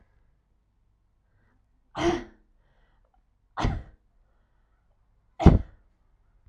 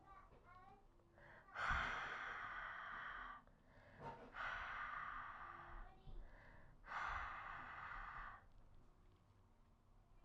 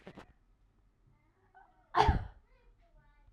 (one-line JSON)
{"three_cough_length": "6.5 s", "three_cough_amplitude": 26585, "three_cough_signal_mean_std_ratio": 0.2, "exhalation_length": "10.2 s", "exhalation_amplitude": 1039, "exhalation_signal_mean_std_ratio": 0.73, "cough_length": "3.3 s", "cough_amplitude": 8468, "cough_signal_mean_std_ratio": 0.25, "survey_phase": "alpha (2021-03-01 to 2021-08-12)", "age": "18-44", "gender": "Female", "wearing_mask": "No", "symptom_none": true, "smoker_status": "Never smoked", "respiratory_condition_asthma": false, "respiratory_condition_other": false, "recruitment_source": "REACT", "submission_delay": "1 day", "covid_test_result": "Negative", "covid_test_method": "RT-qPCR"}